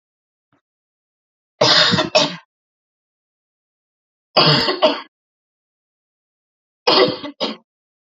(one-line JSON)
{"three_cough_length": "8.1 s", "three_cough_amplitude": 30148, "three_cough_signal_mean_std_ratio": 0.35, "survey_phase": "beta (2021-08-13 to 2022-03-07)", "age": "18-44", "gender": "Female", "wearing_mask": "No", "symptom_cough_any": true, "symptom_runny_or_blocked_nose": true, "symptom_shortness_of_breath": true, "symptom_sore_throat": true, "symptom_fatigue": true, "symptom_fever_high_temperature": true, "symptom_headache": true, "symptom_onset": "3 days", "smoker_status": "Ex-smoker", "respiratory_condition_asthma": true, "respiratory_condition_other": false, "recruitment_source": "Test and Trace", "submission_delay": "2 days", "covid_test_result": "Positive", "covid_test_method": "RT-qPCR", "covid_ct_value": 26.0, "covid_ct_gene": "N gene"}